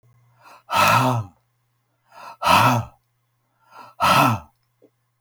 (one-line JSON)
{"exhalation_length": "5.2 s", "exhalation_amplitude": 25786, "exhalation_signal_mean_std_ratio": 0.43, "survey_phase": "alpha (2021-03-01 to 2021-08-12)", "age": "65+", "gender": "Male", "wearing_mask": "No", "symptom_none": true, "smoker_status": "Never smoked", "respiratory_condition_asthma": false, "respiratory_condition_other": false, "recruitment_source": "REACT", "submission_delay": "1 day", "covid_test_result": "Negative", "covid_test_method": "RT-qPCR"}